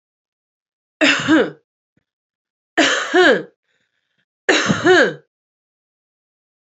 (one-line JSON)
{"three_cough_length": "6.7 s", "three_cough_amplitude": 28389, "three_cough_signal_mean_std_ratio": 0.4, "survey_phase": "beta (2021-08-13 to 2022-03-07)", "age": "18-44", "gender": "Female", "wearing_mask": "No", "symptom_none": true, "smoker_status": "Current smoker (11 or more cigarettes per day)", "respiratory_condition_asthma": true, "respiratory_condition_other": false, "recruitment_source": "REACT", "submission_delay": "2 days", "covid_test_result": "Negative", "covid_test_method": "RT-qPCR", "influenza_a_test_result": "Negative", "influenza_b_test_result": "Negative"}